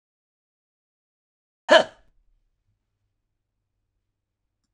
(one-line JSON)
{"cough_length": "4.7 s", "cough_amplitude": 26027, "cough_signal_mean_std_ratio": 0.13, "survey_phase": "alpha (2021-03-01 to 2021-08-12)", "age": "65+", "gender": "Male", "wearing_mask": "No", "symptom_none": true, "smoker_status": "Never smoked", "respiratory_condition_asthma": false, "respiratory_condition_other": false, "recruitment_source": "REACT", "submission_delay": "1 day", "covid_test_result": "Negative", "covid_test_method": "RT-qPCR"}